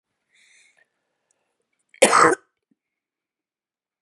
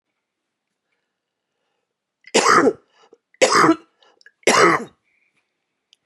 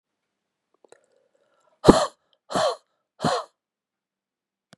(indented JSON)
{
  "cough_length": "4.0 s",
  "cough_amplitude": 31297,
  "cough_signal_mean_std_ratio": 0.22,
  "three_cough_length": "6.1 s",
  "three_cough_amplitude": 32156,
  "three_cough_signal_mean_std_ratio": 0.34,
  "exhalation_length": "4.8 s",
  "exhalation_amplitude": 32768,
  "exhalation_signal_mean_std_ratio": 0.23,
  "survey_phase": "beta (2021-08-13 to 2022-03-07)",
  "age": "45-64",
  "gender": "Female",
  "wearing_mask": "No",
  "symptom_cough_any": true,
  "symptom_fatigue": true,
  "symptom_headache": true,
  "symptom_other": true,
  "symptom_onset": "8 days",
  "smoker_status": "Never smoked",
  "respiratory_condition_asthma": false,
  "respiratory_condition_other": true,
  "recruitment_source": "Test and Trace",
  "submission_delay": "1 day",
  "covid_test_result": "Negative",
  "covid_test_method": "RT-qPCR"
}